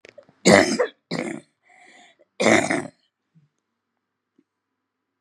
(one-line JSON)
{"three_cough_length": "5.2 s", "three_cough_amplitude": 32768, "three_cough_signal_mean_std_ratio": 0.31, "survey_phase": "beta (2021-08-13 to 2022-03-07)", "age": "65+", "gender": "Female", "wearing_mask": "No", "symptom_cough_any": true, "symptom_sore_throat": true, "symptom_diarrhoea": true, "symptom_fatigue": true, "symptom_headache": true, "symptom_onset": "3 days", "smoker_status": "Never smoked", "respiratory_condition_asthma": false, "respiratory_condition_other": false, "recruitment_source": "Test and Trace", "submission_delay": "0 days", "covid_test_result": "Positive", "covid_test_method": "RT-qPCR", "covid_ct_value": 22.2, "covid_ct_gene": "ORF1ab gene", "covid_ct_mean": 22.6, "covid_viral_load": "38000 copies/ml", "covid_viral_load_category": "Low viral load (10K-1M copies/ml)"}